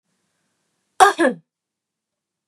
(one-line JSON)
{"cough_length": "2.5 s", "cough_amplitude": 32768, "cough_signal_mean_std_ratio": 0.24, "survey_phase": "beta (2021-08-13 to 2022-03-07)", "age": "45-64", "gender": "Female", "wearing_mask": "No", "symptom_cough_any": true, "symptom_fatigue": true, "smoker_status": "Never smoked", "respiratory_condition_asthma": false, "respiratory_condition_other": false, "recruitment_source": "REACT", "submission_delay": "6 days", "covid_test_result": "Negative", "covid_test_method": "RT-qPCR", "influenza_a_test_result": "Negative", "influenza_b_test_result": "Negative"}